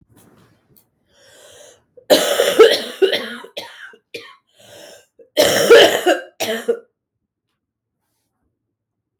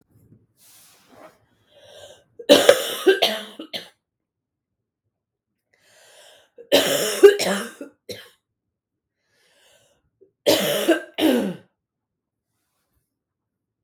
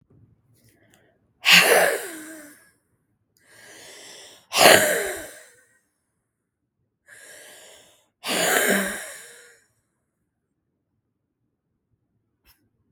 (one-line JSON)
{"cough_length": "9.2 s", "cough_amplitude": 32768, "cough_signal_mean_std_ratio": 0.35, "three_cough_length": "13.8 s", "three_cough_amplitude": 32768, "three_cough_signal_mean_std_ratio": 0.3, "exhalation_length": "12.9 s", "exhalation_amplitude": 32768, "exhalation_signal_mean_std_ratio": 0.3, "survey_phase": "beta (2021-08-13 to 2022-03-07)", "age": "18-44", "gender": "Female", "wearing_mask": "No", "symptom_cough_any": true, "symptom_runny_or_blocked_nose": true, "symptom_shortness_of_breath": true, "symptom_sore_throat": true, "symptom_abdominal_pain": true, "symptom_diarrhoea": true, "symptom_fatigue": true, "symptom_headache": true, "symptom_change_to_sense_of_smell_or_taste": true, "symptom_loss_of_taste": true, "symptom_onset": "4 days", "smoker_status": "Ex-smoker", "respiratory_condition_asthma": true, "respiratory_condition_other": false, "recruitment_source": "Test and Trace", "submission_delay": "2 days", "covid_test_result": "Positive", "covid_test_method": "ePCR"}